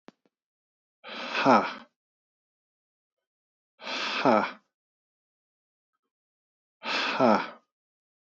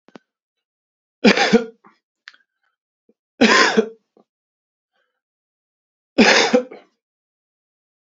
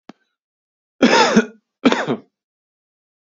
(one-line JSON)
{"exhalation_length": "8.3 s", "exhalation_amplitude": 16369, "exhalation_signal_mean_std_ratio": 0.32, "three_cough_length": "8.0 s", "three_cough_amplitude": 32768, "three_cough_signal_mean_std_ratio": 0.3, "cough_length": "3.3 s", "cough_amplitude": 32438, "cough_signal_mean_std_ratio": 0.35, "survey_phase": "beta (2021-08-13 to 2022-03-07)", "age": "45-64", "gender": "Male", "wearing_mask": "No", "symptom_none": true, "symptom_onset": "7 days", "smoker_status": "Ex-smoker", "respiratory_condition_asthma": true, "respiratory_condition_other": false, "recruitment_source": "REACT", "submission_delay": "1 day", "covid_test_result": "Negative", "covid_test_method": "RT-qPCR", "influenza_a_test_result": "Negative", "influenza_b_test_result": "Negative"}